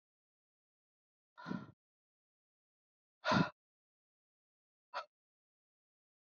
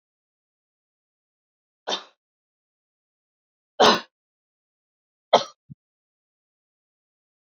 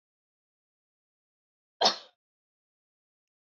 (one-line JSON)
{"exhalation_length": "6.3 s", "exhalation_amplitude": 3499, "exhalation_signal_mean_std_ratio": 0.19, "three_cough_length": "7.4 s", "three_cough_amplitude": 28278, "three_cough_signal_mean_std_ratio": 0.16, "cough_length": "3.5 s", "cough_amplitude": 11655, "cough_signal_mean_std_ratio": 0.15, "survey_phase": "beta (2021-08-13 to 2022-03-07)", "age": "45-64", "gender": "Female", "wearing_mask": "No", "symptom_fatigue": true, "symptom_change_to_sense_of_smell_or_taste": true, "smoker_status": "Never smoked", "respiratory_condition_asthma": false, "respiratory_condition_other": false, "recruitment_source": "Test and Trace", "submission_delay": "1 day", "covid_test_result": "Positive", "covid_test_method": "LFT"}